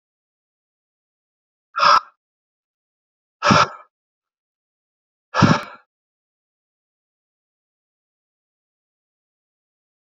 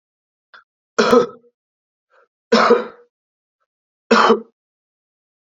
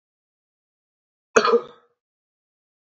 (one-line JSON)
{"exhalation_length": "10.2 s", "exhalation_amplitude": 29632, "exhalation_signal_mean_std_ratio": 0.21, "three_cough_length": "5.5 s", "three_cough_amplitude": 29966, "three_cough_signal_mean_std_ratio": 0.32, "cough_length": "2.8 s", "cough_amplitude": 26873, "cough_signal_mean_std_ratio": 0.22, "survey_phase": "beta (2021-08-13 to 2022-03-07)", "age": "18-44", "gender": "Male", "wearing_mask": "No", "symptom_sore_throat": true, "symptom_fatigue": true, "symptom_headache": true, "symptom_change_to_sense_of_smell_or_taste": true, "symptom_onset": "5 days", "smoker_status": "Never smoked", "respiratory_condition_asthma": false, "respiratory_condition_other": false, "recruitment_source": "Test and Trace", "submission_delay": "1 day", "covid_test_result": "Positive", "covid_test_method": "RT-qPCR", "covid_ct_value": 14.9, "covid_ct_gene": "ORF1ab gene", "covid_ct_mean": 15.3, "covid_viral_load": "9200000 copies/ml", "covid_viral_load_category": "High viral load (>1M copies/ml)"}